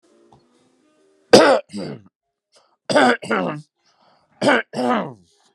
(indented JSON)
{
  "three_cough_length": "5.5 s",
  "three_cough_amplitude": 32768,
  "three_cough_signal_mean_std_ratio": 0.37,
  "survey_phase": "beta (2021-08-13 to 2022-03-07)",
  "age": "18-44",
  "gender": "Male",
  "wearing_mask": "No",
  "symptom_none": true,
  "smoker_status": "Ex-smoker",
  "respiratory_condition_asthma": true,
  "respiratory_condition_other": false,
  "recruitment_source": "REACT",
  "submission_delay": "1 day",
  "covid_test_result": "Negative",
  "covid_test_method": "RT-qPCR"
}